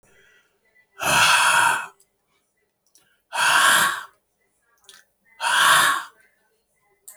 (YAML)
exhalation_length: 7.2 s
exhalation_amplitude: 24485
exhalation_signal_mean_std_ratio: 0.46
survey_phase: alpha (2021-03-01 to 2021-08-12)
age: 65+
gender: Male
wearing_mask: 'No'
symptom_abdominal_pain: true
smoker_status: Never smoked
respiratory_condition_asthma: false
respiratory_condition_other: false
recruitment_source: REACT
submission_delay: 8 days
covid_test_result: Negative
covid_test_method: RT-qPCR